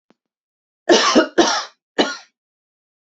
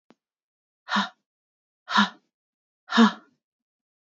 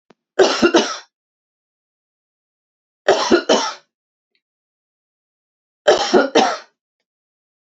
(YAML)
cough_length: 3.1 s
cough_amplitude: 29200
cough_signal_mean_std_ratio: 0.39
exhalation_length: 4.0 s
exhalation_amplitude: 20312
exhalation_signal_mean_std_ratio: 0.27
three_cough_length: 7.8 s
three_cough_amplitude: 29116
three_cough_signal_mean_std_ratio: 0.35
survey_phase: beta (2021-08-13 to 2022-03-07)
age: 45-64
gender: Female
wearing_mask: 'No'
symptom_none: true
smoker_status: Ex-smoker
respiratory_condition_asthma: false
respiratory_condition_other: false
recruitment_source: Test and Trace
submission_delay: 1 day
covid_test_result: Negative
covid_test_method: RT-qPCR